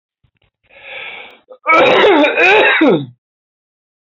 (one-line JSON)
{"cough_length": "4.1 s", "cough_amplitude": 28932, "cough_signal_mean_std_ratio": 0.54, "survey_phase": "alpha (2021-03-01 to 2021-08-12)", "age": "65+", "gender": "Male", "wearing_mask": "No", "symptom_none": true, "smoker_status": "Never smoked", "respiratory_condition_asthma": false, "respiratory_condition_other": false, "recruitment_source": "REACT", "submission_delay": "8 days", "covid_test_result": "Negative", "covid_test_method": "RT-qPCR"}